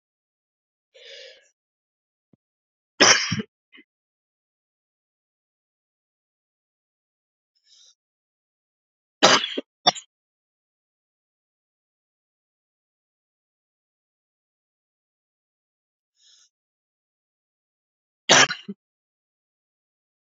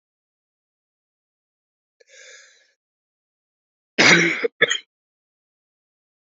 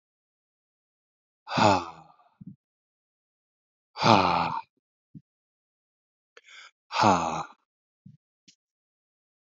three_cough_length: 20.2 s
three_cough_amplitude: 32767
three_cough_signal_mean_std_ratio: 0.15
cough_length: 6.4 s
cough_amplitude: 28428
cough_signal_mean_std_ratio: 0.23
exhalation_length: 9.5 s
exhalation_amplitude: 22765
exhalation_signal_mean_std_ratio: 0.28
survey_phase: alpha (2021-03-01 to 2021-08-12)
age: 18-44
gender: Male
wearing_mask: 'No'
symptom_cough_any: true
symptom_new_continuous_cough: true
symptom_shortness_of_breath: true
symptom_fatigue: true
symptom_onset: 3 days
smoker_status: Never smoked
respiratory_condition_asthma: false
respiratory_condition_other: false
recruitment_source: Test and Trace
submission_delay: 1 day
covid_test_result: Positive
covid_test_method: RT-qPCR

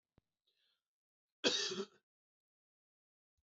cough_length: 3.5 s
cough_amplitude: 3931
cough_signal_mean_std_ratio: 0.25
survey_phase: beta (2021-08-13 to 2022-03-07)
age: 45-64
gender: Male
wearing_mask: 'No'
symptom_runny_or_blocked_nose: true
symptom_sore_throat: true
symptom_headache: true
symptom_onset: 3 days
smoker_status: Ex-smoker
respiratory_condition_asthma: false
respiratory_condition_other: false
recruitment_source: Test and Trace
submission_delay: 2 days
covid_test_result: Positive
covid_test_method: RT-qPCR
covid_ct_value: 20.0
covid_ct_gene: N gene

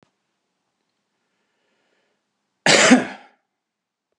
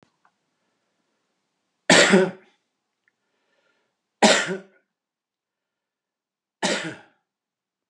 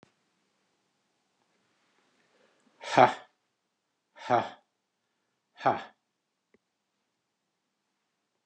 cough_length: 4.2 s
cough_amplitude: 32678
cough_signal_mean_std_ratio: 0.24
three_cough_length: 7.9 s
three_cough_amplitude: 27780
three_cough_signal_mean_std_ratio: 0.25
exhalation_length: 8.5 s
exhalation_amplitude: 17258
exhalation_signal_mean_std_ratio: 0.17
survey_phase: beta (2021-08-13 to 2022-03-07)
age: 65+
gender: Male
wearing_mask: 'No'
symptom_none: true
smoker_status: Ex-smoker
respiratory_condition_asthma: false
respiratory_condition_other: false
recruitment_source: REACT
submission_delay: 2 days
covid_test_result: Negative
covid_test_method: RT-qPCR
influenza_a_test_result: Negative
influenza_b_test_result: Negative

